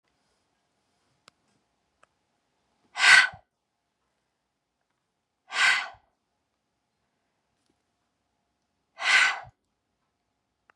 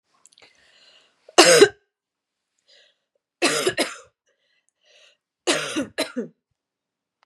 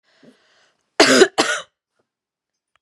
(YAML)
exhalation_length: 10.8 s
exhalation_amplitude: 24357
exhalation_signal_mean_std_ratio: 0.22
three_cough_length: 7.3 s
three_cough_amplitude: 32728
three_cough_signal_mean_std_ratio: 0.27
cough_length: 2.8 s
cough_amplitude: 32767
cough_signal_mean_std_ratio: 0.3
survey_phase: beta (2021-08-13 to 2022-03-07)
age: 18-44
gender: Female
wearing_mask: 'No'
symptom_none: true
smoker_status: Never smoked
recruitment_source: REACT
submission_delay: 0 days
covid_test_result: Negative
covid_test_method: RT-qPCR
influenza_a_test_result: Negative
influenza_b_test_result: Negative